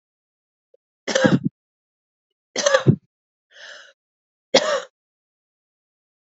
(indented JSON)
{
  "three_cough_length": "6.2 s",
  "three_cough_amplitude": 29052,
  "three_cough_signal_mean_std_ratio": 0.28,
  "survey_phase": "beta (2021-08-13 to 2022-03-07)",
  "age": "45-64",
  "gender": "Female",
  "wearing_mask": "No",
  "symptom_cough_any": true,
  "symptom_runny_or_blocked_nose": true,
  "symptom_shortness_of_breath": true,
  "symptom_abdominal_pain": true,
  "symptom_fatigue": true,
  "symptom_onset": "3 days",
  "smoker_status": "Never smoked",
  "respiratory_condition_asthma": true,
  "respiratory_condition_other": false,
  "recruitment_source": "Test and Trace",
  "submission_delay": "2 days",
  "covid_test_result": "Positive",
  "covid_test_method": "RT-qPCR",
  "covid_ct_value": 24.6,
  "covid_ct_gene": "N gene",
  "covid_ct_mean": 24.7,
  "covid_viral_load": "7800 copies/ml",
  "covid_viral_load_category": "Minimal viral load (< 10K copies/ml)"
}